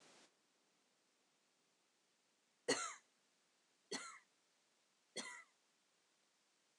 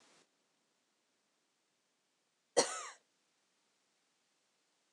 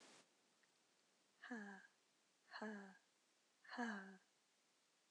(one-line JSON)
{"three_cough_length": "6.8 s", "three_cough_amplitude": 1931, "three_cough_signal_mean_std_ratio": 0.25, "cough_length": "4.9 s", "cough_amplitude": 5921, "cough_signal_mean_std_ratio": 0.16, "exhalation_length": "5.1 s", "exhalation_amplitude": 578, "exhalation_signal_mean_std_ratio": 0.43, "survey_phase": "beta (2021-08-13 to 2022-03-07)", "age": "18-44", "gender": "Female", "wearing_mask": "No", "symptom_none": true, "symptom_onset": "8 days", "smoker_status": "Never smoked", "respiratory_condition_asthma": false, "respiratory_condition_other": false, "recruitment_source": "REACT", "submission_delay": "4 days", "covid_test_result": "Negative", "covid_test_method": "RT-qPCR", "influenza_a_test_result": "Negative", "influenza_b_test_result": "Negative"}